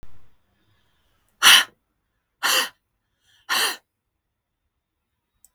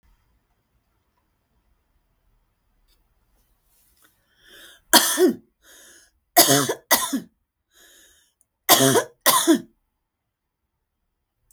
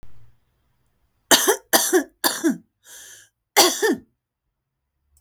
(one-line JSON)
{"exhalation_length": "5.5 s", "exhalation_amplitude": 32768, "exhalation_signal_mean_std_ratio": 0.26, "three_cough_length": "11.5 s", "three_cough_amplitude": 32768, "three_cough_signal_mean_std_ratio": 0.29, "cough_length": "5.2 s", "cough_amplitude": 32768, "cough_signal_mean_std_ratio": 0.37, "survey_phase": "beta (2021-08-13 to 2022-03-07)", "age": "45-64", "gender": "Female", "wearing_mask": "No", "symptom_none": true, "smoker_status": "Ex-smoker", "respiratory_condition_asthma": false, "respiratory_condition_other": false, "recruitment_source": "REACT", "submission_delay": "1 day", "covid_test_result": "Negative", "covid_test_method": "RT-qPCR"}